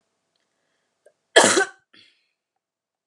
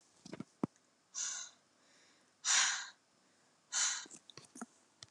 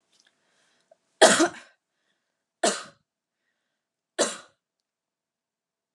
{"cough_length": "3.1 s", "cough_amplitude": 32767, "cough_signal_mean_std_ratio": 0.23, "exhalation_length": "5.1 s", "exhalation_amplitude": 4266, "exhalation_signal_mean_std_ratio": 0.37, "three_cough_length": "5.9 s", "three_cough_amplitude": 30119, "three_cough_signal_mean_std_ratio": 0.22, "survey_phase": "alpha (2021-03-01 to 2021-08-12)", "age": "18-44", "gender": "Female", "wearing_mask": "No", "symptom_cough_any": true, "symptom_fatigue": true, "symptom_headache": true, "symptom_onset": "3 days", "smoker_status": "Current smoker (e-cigarettes or vapes only)", "respiratory_condition_asthma": false, "respiratory_condition_other": false, "recruitment_source": "Test and Trace", "submission_delay": "2 days", "covid_test_result": "Positive", "covid_test_method": "RT-qPCR", "covid_ct_value": 19.0, "covid_ct_gene": "ORF1ab gene", "covid_ct_mean": 19.2, "covid_viral_load": "500000 copies/ml", "covid_viral_load_category": "Low viral load (10K-1M copies/ml)"}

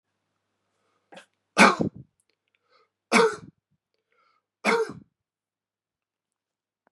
{"three_cough_length": "6.9 s", "three_cough_amplitude": 27180, "three_cough_signal_mean_std_ratio": 0.24, "survey_phase": "beta (2021-08-13 to 2022-03-07)", "age": "65+", "gender": "Male", "wearing_mask": "No", "symptom_runny_or_blocked_nose": true, "symptom_onset": "3 days", "smoker_status": "Never smoked", "respiratory_condition_asthma": false, "respiratory_condition_other": false, "recruitment_source": "Test and Trace", "submission_delay": "2 days", "covid_test_result": "Positive", "covid_test_method": "RT-qPCR", "covid_ct_value": 19.9, "covid_ct_gene": "ORF1ab gene", "covid_ct_mean": 20.4, "covid_viral_load": "210000 copies/ml", "covid_viral_load_category": "Low viral load (10K-1M copies/ml)"}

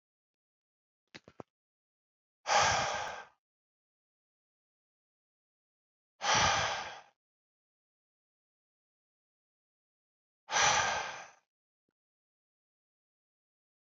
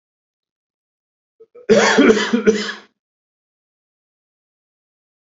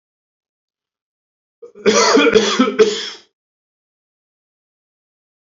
{"exhalation_length": "13.8 s", "exhalation_amplitude": 6522, "exhalation_signal_mean_std_ratio": 0.29, "cough_length": "5.4 s", "cough_amplitude": 28576, "cough_signal_mean_std_ratio": 0.32, "three_cough_length": "5.5 s", "three_cough_amplitude": 28356, "three_cough_signal_mean_std_ratio": 0.36, "survey_phase": "beta (2021-08-13 to 2022-03-07)", "age": "45-64", "gender": "Male", "wearing_mask": "No", "symptom_none": true, "smoker_status": "Never smoked", "respiratory_condition_asthma": false, "respiratory_condition_other": false, "recruitment_source": "REACT", "submission_delay": "1 day", "covid_test_result": "Negative", "covid_test_method": "RT-qPCR", "influenza_a_test_result": "Negative", "influenza_b_test_result": "Negative"}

